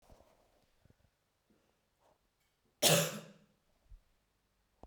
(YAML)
cough_length: 4.9 s
cough_amplitude: 5924
cough_signal_mean_std_ratio: 0.21
survey_phase: beta (2021-08-13 to 2022-03-07)
age: 18-44
gender: Female
wearing_mask: 'No'
symptom_none: true
smoker_status: Ex-smoker
respiratory_condition_asthma: false
respiratory_condition_other: false
recruitment_source: REACT
submission_delay: 4 days
covid_test_result: Negative
covid_test_method: RT-qPCR
influenza_a_test_result: Negative
influenza_b_test_result: Negative